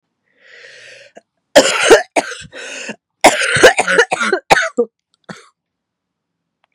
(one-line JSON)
{"three_cough_length": "6.7 s", "three_cough_amplitude": 32768, "three_cough_signal_mean_std_ratio": 0.39, "survey_phase": "beta (2021-08-13 to 2022-03-07)", "age": "18-44", "gender": "Female", "wearing_mask": "No", "symptom_cough_any": true, "symptom_shortness_of_breath": true, "symptom_diarrhoea": true, "symptom_fatigue": true, "symptom_other": true, "symptom_onset": "3 days", "smoker_status": "Never smoked", "respiratory_condition_asthma": false, "respiratory_condition_other": false, "recruitment_source": "Test and Trace", "submission_delay": "2 days", "covid_test_result": "Positive", "covid_test_method": "RT-qPCR", "covid_ct_value": 19.1, "covid_ct_gene": "ORF1ab gene", "covid_ct_mean": 19.8, "covid_viral_load": "330000 copies/ml", "covid_viral_load_category": "Low viral load (10K-1M copies/ml)"}